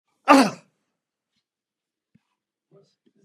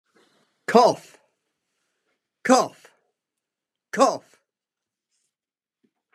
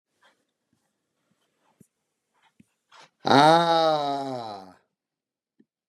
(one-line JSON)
{"cough_length": "3.2 s", "cough_amplitude": 31774, "cough_signal_mean_std_ratio": 0.2, "three_cough_length": "6.1 s", "three_cough_amplitude": 29045, "three_cough_signal_mean_std_ratio": 0.24, "exhalation_length": "5.9 s", "exhalation_amplitude": 23408, "exhalation_signal_mean_std_ratio": 0.31, "survey_phase": "beta (2021-08-13 to 2022-03-07)", "age": "65+", "gender": "Male", "wearing_mask": "No", "symptom_none": true, "smoker_status": "Ex-smoker", "respiratory_condition_asthma": false, "respiratory_condition_other": false, "recruitment_source": "REACT", "submission_delay": "2 days", "covid_test_result": "Negative", "covid_test_method": "RT-qPCR", "influenza_a_test_result": "Negative", "influenza_b_test_result": "Negative"}